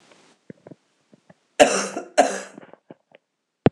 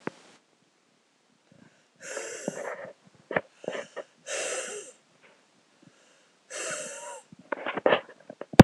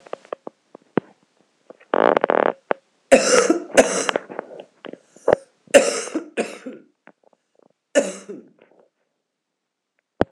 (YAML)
cough_length: 3.7 s
cough_amplitude: 26028
cough_signal_mean_std_ratio: 0.26
exhalation_length: 8.6 s
exhalation_amplitude: 26028
exhalation_signal_mean_std_ratio: 0.21
three_cough_length: 10.3 s
three_cough_amplitude: 26028
three_cough_signal_mean_std_ratio: 0.3
survey_phase: beta (2021-08-13 to 2022-03-07)
age: 45-64
gender: Female
wearing_mask: 'No'
symptom_new_continuous_cough: true
symptom_runny_or_blocked_nose: true
symptom_shortness_of_breath: true
symptom_sore_throat: true
symptom_diarrhoea: true
symptom_fever_high_temperature: true
symptom_headache: true
symptom_change_to_sense_of_smell_or_taste: true
symptom_loss_of_taste: true
symptom_onset: 5 days
smoker_status: Current smoker (1 to 10 cigarettes per day)
respiratory_condition_asthma: false
respiratory_condition_other: false
recruitment_source: Test and Trace
submission_delay: 2 days
covid_test_result: Positive
covid_test_method: RT-qPCR
covid_ct_value: 18.5
covid_ct_gene: N gene